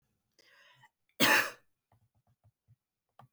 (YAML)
cough_length: 3.3 s
cough_amplitude: 8458
cough_signal_mean_std_ratio: 0.24
survey_phase: beta (2021-08-13 to 2022-03-07)
age: 45-64
gender: Female
wearing_mask: 'No'
symptom_none: true
smoker_status: Ex-smoker
respiratory_condition_asthma: false
respiratory_condition_other: false
recruitment_source: REACT
submission_delay: 1 day
covid_test_result: Negative
covid_test_method: RT-qPCR
influenza_a_test_result: Negative
influenza_b_test_result: Negative